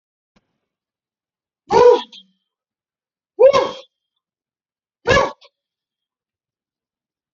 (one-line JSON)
{"exhalation_length": "7.3 s", "exhalation_amplitude": 32767, "exhalation_signal_mean_std_ratio": 0.26, "survey_phase": "beta (2021-08-13 to 2022-03-07)", "age": "45-64", "gender": "Male", "wearing_mask": "No", "symptom_none": true, "smoker_status": "Ex-smoker", "respiratory_condition_asthma": false, "respiratory_condition_other": false, "recruitment_source": "REACT", "submission_delay": "1 day", "covid_test_result": "Negative", "covid_test_method": "RT-qPCR"}